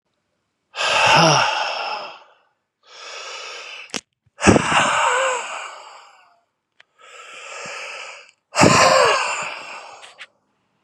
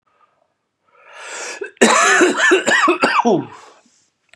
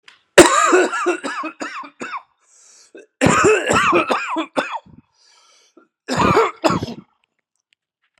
{"exhalation_length": "10.8 s", "exhalation_amplitude": 32767, "exhalation_signal_mean_std_ratio": 0.48, "cough_length": "4.4 s", "cough_amplitude": 32768, "cough_signal_mean_std_ratio": 0.55, "three_cough_length": "8.2 s", "three_cough_amplitude": 32768, "three_cough_signal_mean_std_ratio": 0.48, "survey_phase": "beta (2021-08-13 to 2022-03-07)", "age": "45-64", "gender": "Male", "wearing_mask": "No", "symptom_runny_or_blocked_nose": true, "symptom_fatigue": true, "smoker_status": "Never smoked", "respiratory_condition_asthma": false, "respiratory_condition_other": false, "recruitment_source": "Test and Trace", "submission_delay": "3 days", "covid_test_result": "Positive", "covid_test_method": "RT-qPCR", "covid_ct_value": 23.5, "covid_ct_gene": "S gene", "covid_ct_mean": 24.0, "covid_viral_load": "13000 copies/ml", "covid_viral_load_category": "Low viral load (10K-1M copies/ml)"}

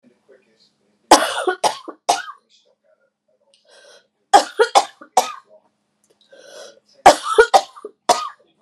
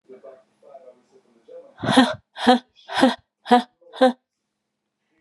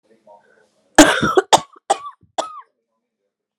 {"three_cough_length": "8.6 s", "three_cough_amplitude": 32768, "three_cough_signal_mean_std_ratio": 0.29, "exhalation_length": "5.2 s", "exhalation_amplitude": 30440, "exhalation_signal_mean_std_ratio": 0.32, "cough_length": "3.6 s", "cough_amplitude": 32768, "cough_signal_mean_std_ratio": 0.29, "survey_phase": "alpha (2021-03-01 to 2021-08-12)", "age": "45-64", "gender": "Female", "wearing_mask": "No", "symptom_cough_any": true, "symptom_abdominal_pain": true, "smoker_status": "Never smoked", "respiratory_condition_asthma": false, "respiratory_condition_other": false, "recruitment_source": "Test and Trace", "submission_delay": "2 days", "covid_test_result": "Positive", "covid_test_method": "RT-qPCR"}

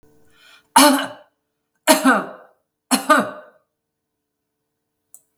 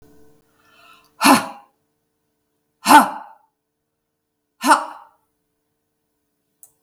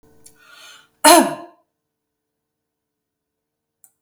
{"three_cough_length": "5.4 s", "three_cough_amplitude": 32768, "three_cough_signal_mean_std_ratio": 0.32, "exhalation_length": "6.8 s", "exhalation_amplitude": 32766, "exhalation_signal_mean_std_ratio": 0.24, "cough_length": "4.0 s", "cough_amplitude": 32768, "cough_signal_mean_std_ratio": 0.21, "survey_phase": "beta (2021-08-13 to 2022-03-07)", "age": "65+", "gender": "Female", "wearing_mask": "No", "symptom_none": true, "smoker_status": "Never smoked", "respiratory_condition_asthma": false, "respiratory_condition_other": false, "recruitment_source": "Test and Trace", "submission_delay": "1 day", "covid_test_result": "Negative", "covid_test_method": "ePCR"}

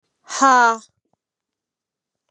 {"exhalation_length": "2.3 s", "exhalation_amplitude": 28099, "exhalation_signal_mean_std_ratio": 0.32, "survey_phase": "beta (2021-08-13 to 2022-03-07)", "age": "18-44", "gender": "Female", "wearing_mask": "No", "symptom_none": true, "smoker_status": "Never smoked", "respiratory_condition_asthma": false, "respiratory_condition_other": false, "recruitment_source": "REACT", "submission_delay": "1 day", "covid_test_result": "Negative", "covid_test_method": "RT-qPCR", "influenza_a_test_result": "Negative", "influenza_b_test_result": "Negative"}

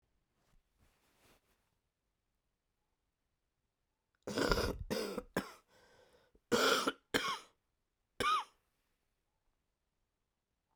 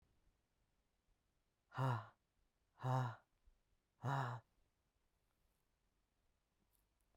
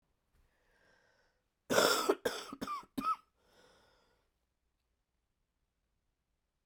{"three_cough_length": "10.8 s", "three_cough_amplitude": 5636, "three_cough_signal_mean_std_ratio": 0.31, "exhalation_length": "7.2 s", "exhalation_amplitude": 1194, "exhalation_signal_mean_std_ratio": 0.31, "cough_length": "6.7 s", "cough_amplitude": 7399, "cough_signal_mean_std_ratio": 0.28, "survey_phase": "beta (2021-08-13 to 2022-03-07)", "age": "45-64", "gender": "Female", "wearing_mask": "No", "symptom_cough_any": true, "symptom_runny_or_blocked_nose": true, "symptom_sore_throat": true, "symptom_abdominal_pain": true, "symptom_fatigue": true, "symptom_headache": true, "symptom_other": true, "smoker_status": "Ex-smoker", "respiratory_condition_asthma": false, "respiratory_condition_other": false, "recruitment_source": "Test and Trace", "submission_delay": "2 days", "covid_test_result": "Positive", "covid_test_method": "RT-qPCR", "covid_ct_value": 15.2, "covid_ct_gene": "ORF1ab gene", "covid_ct_mean": 15.9, "covid_viral_load": "6200000 copies/ml", "covid_viral_load_category": "High viral load (>1M copies/ml)"}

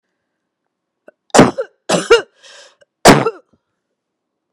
{"three_cough_length": "4.5 s", "three_cough_amplitude": 32768, "three_cough_signal_mean_std_ratio": 0.29, "survey_phase": "beta (2021-08-13 to 2022-03-07)", "age": "45-64", "gender": "Female", "wearing_mask": "No", "symptom_none": true, "smoker_status": "Ex-smoker", "respiratory_condition_asthma": false, "respiratory_condition_other": false, "recruitment_source": "REACT", "submission_delay": "0 days", "covid_test_result": "Negative", "covid_test_method": "RT-qPCR", "influenza_a_test_result": "Negative", "influenza_b_test_result": "Negative"}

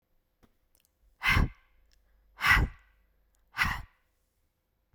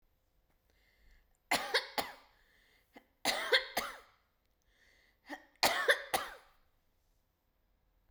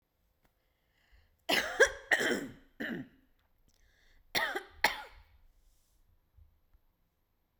{"exhalation_length": "4.9 s", "exhalation_amplitude": 10942, "exhalation_signal_mean_std_ratio": 0.31, "three_cough_length": "8.1 s", "three_cough_amplitude": 8250, "three_cough_signal_mean_std_ratio": 0.31, "cough_length": "7.6 s", "cough_amplitude": 9954, "cough_signal_mean_std_ratio": 0.3, "survey_phase": "beta (2021-08-13 to 2022-03-07)", "age": "45-64", "gender": "Female", "wearing_mask": "No", "symptom_none": true, "smoker_status": "Never smoked", "respiratory_condition_asthma": false, "respiratory_condition_other": false, "recruitment_source": "REACT", "submission_delay": "3 days", "covid_test_result": "Negative", "covid_test_method": "RT-qPCR"}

